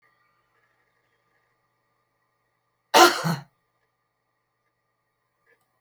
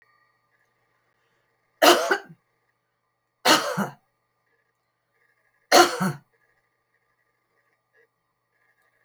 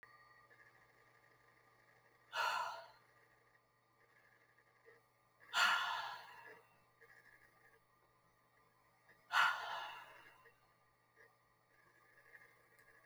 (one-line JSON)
{"cough_length": "5.8 s", "cough_amplitude": 27914, "cough_signal_mean_std_ratio": 0.18, "three_cough_length": "9.0 s", "three_cough_amplitude": 28905, "three_cough_signal_mean_std_ratio": 0.24, "exhalation_length": "13.1 s", "exhalation_amplitude": 3085, "exhalation_signal_mean_std_ratio": 0.31, "survey_phase": "beta (2021-08-13 to 2022-03-07)", "age": "65+", "gender": "Female", "wearing_mask": "No", "symptom_none": true, "smoker_status": "Never smoked", "respiratory_condition_asthma": false, "respiratory_condition_other": false, "recruitment_source": "REACT", "submission_delay": "2 days", "covid_test_result": "Negative", "covid_test_method": "RT-qPCR"}